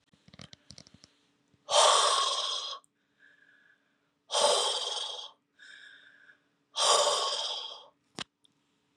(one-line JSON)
{"exhalation_length": "9.0 s", "exhalation_amplitude": 10055, "exhalation_signal_mean_std_ratio": 0.44, "survey_phase": "beta (2021-08-13 to 2022-03-07)", "age": "45-64", "gender": "Female", "wearing_mask": "No", "symptom_none": true, "smoker_status": "Ex-smoker", "respiratory_condition_asthma": false, "respiratory_condition_other": false, "recruitment_source": "REACT", "submission_delay": "2 days", "covid_test_result": "Negative", "covid_test_method": "RT-qPCR", "influenza_a_test_result": "Negative", "influenza_b_test_result": "Negative"}